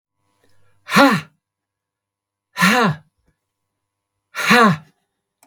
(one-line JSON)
{"exhalation_length": "5.5 s", "exhalation_amplitude": 32768, "exhalation_signal_mean_std_ratio": 0.35, "survey_phase": "beta (2021-08-13 to 2022-03-07)", "age": "65+", "gender": "Male", "wearing_mask": "No", "symptom_none": true, "smoker_status": "Ex-smoker", "respiratory_condition_asthma": false, "respiratory_condition_other": false, "recruitment_source": "REACT", "submission_delay": "2 days", "covid_test_result": "Negative", "covid_test_method": "RT-qPCR", "influenza_a_test_result": "Negative", "influenza_b_test_result": "Negative"}